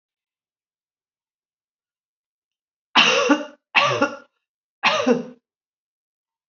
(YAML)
cough_length: 6.5 s
cough_amplitude: 28823
cough_signal_mean_std_ratio: 0.33
survey_phase: alpha (2021-03-01 to 2021-08-12)
age: 65+
gender: Female
wearing_mask: 'No'
symptom_none: true
smoker_status: Ex-smoker
respiratory_condition_asthma: false
respiratory_condition_other: false
recruitment_source: REACT
submission_delay: 2 days
covid_test_result: Negative
covid_test_method: RT-qPCR